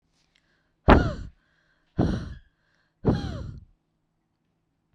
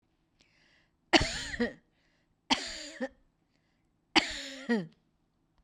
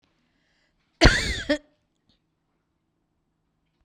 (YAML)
exhalation_length: 4.9 s
exhalation_amplitude: 32767
exhalation_signal_mean_std_ratio: 0.29
three_cough_length: 5.6 s
three_cough_amplitude: 15099
three_cough_signal_mean_std_ratio: 0.31
cough_length: 3.8 s
cough_amplitude: 32767
cough_signal_mean_std_ratio: 0.23
survey_phase: beta (2021-08-13 to 2022-03-07)
age: 65+
gender: Female
wearing_mask: 'No'
symptom_fatigue: true
symptom_headache: true
smoker_status: Ex-smoker
respiratory_condition_asthma: true
respiratory_condition_other: false
recruitment_source: REACT
submission_delay: 2 days
covid_test_result: Negative
covid_test_method: RT-qPCR
influenza_a_test_result: Unknown/Void
influenza_b_test_result: Unknown/Void